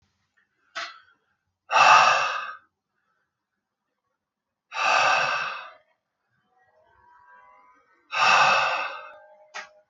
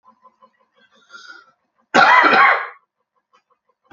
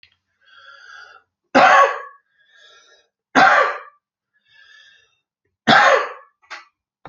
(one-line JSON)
{"exhalation_length": "9.9 s", "exhalation_amplitude": 24035, "exhalation_signal_mean_std_ratio": 0.39, "cough_length": "3.9 s", "cough_amplitude": 29421, "cough_signal_mean_std_ratio": 0.36, "three_cough_length": "7.1 s", "three_cough_amplitude": 32767, "three_cough_signal_mean_std_ratio": 0.34, "survey_phase": "alpha (2021-03-01 to 2021-08-12)", "age": "45-64", "gender": "Male", "wearing_mask": "No", "symptom_cough_any": true, "smoker_status": "Ex-smoker", "respiratory_condition_asthma": false, "respiratory_condition_other": false, "recruitment_source": "REACT", "submission_delay": "1 day", "covid_test_result": "Negative", "covid_test_method": "RT-qPCR"}